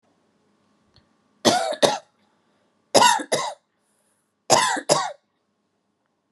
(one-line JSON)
{"three_cough_length": "6.3 s", "three_cough_amplitude": 32671, "three_cough_signal_mean_std_ratio": 0.35, "survey_phase": "beta (2021-08-13 to 2022-03-07)", "age": "45-64", "gender": "Female", "wearing_mask": "No", "symptom_none": true, "smoker_status": "Never smoked", "respiratory_condition_asthma": false, "respiratory_condition_other": false, "recruitment_source": "REACT", "submission_delay": "3 days", "covid_test_result": "Negative", "covid_test_method": "RT-qPCR"}